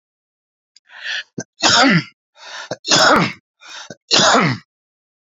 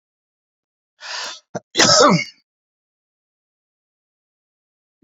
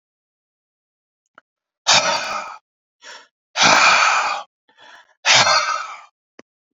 three_cough_length: 5.3 s
three_cough_amplitude: 32768
three_cough_signal_mean_std_ratio: 0.45
cough_length: 5.0 s
cough_amplitude: 32767
cough_signal_mean_std_ratio: 0.27
exhalation_length: 6.7 s
exhalation_amplitude: 32768
exhalation_signal_mean_std_ratio: 0.43
survey_phase: beta (2021-08-13 to 2022-03-07)
age: 45-64
gender: Male
wearing_mask: 'No'
symptom_abdominal_pain: true
symptom_diarrhoea: true
symptom_headache: true
symptom_onset: 4 days
smoker_status: Current smoker (1 to 10 cigarettes per day)
respiratory_condition_asthma: false
respiratory_condition_other: false
recruitment_source: Test and Trace
submission_delay: 2 days
covid_test_result: Negative
covid_test_method: RT-qPCR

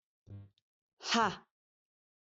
exhalation_length: 2.2 s
exhalation_amplitude: 4814
exhalation_signal_mean_std_ratio: 0.29
survey_phase: beta (2021-08-13 to 2022-03-07)
age: 45-64
gender: Female
wearing_mask: 'No'
symptom_none: true
smoker_status: Never smoked
respiratory_condition_asthma: true
respiratory_condition_other: false
recruitment_source: REACT
submission_delay: 1 day
covid_test_result: Negative
covid_test_method: RT-qPCR
influenza_a_test_result: Negative
influenza_b_test_result: Negative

